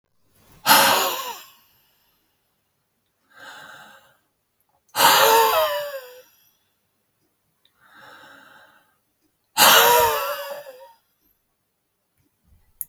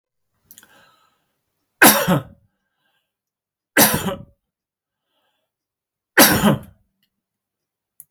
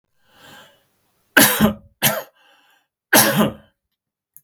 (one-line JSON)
{"exhalation_length": "12.9 s", "exhalation_amplitude": 32768, "exhalation_signal_mean_std_ratio": 0.35, "three_cough_length": "8.1 s", "three_cough_amplitude": 32768, "three_cough_signal_mean_std_ratio": 0.28, "cough_length": "4.4 s", "cough_amplitude": 32768, "cough_signal_mean_std_ratio": 0.35, "survey_phase": "beta (2021-08-13 to 2022-03-07)", "age": "45-64", "gender": "Male", "wearing_mask": "No", "symptom_none": true, "smoker_status": "Never smoked", "respiratory_condition_asthma": false, "respiratory_condition_other": false, "recruitment_source": "REACT", "submission_delay": "3 days", "covid_test_result": "Negative", "covid_test_method": "RT-qPCR", "influenza_a_test_result": "Unknown/Void", "influenza_b_test_result": "Unknown/Void"}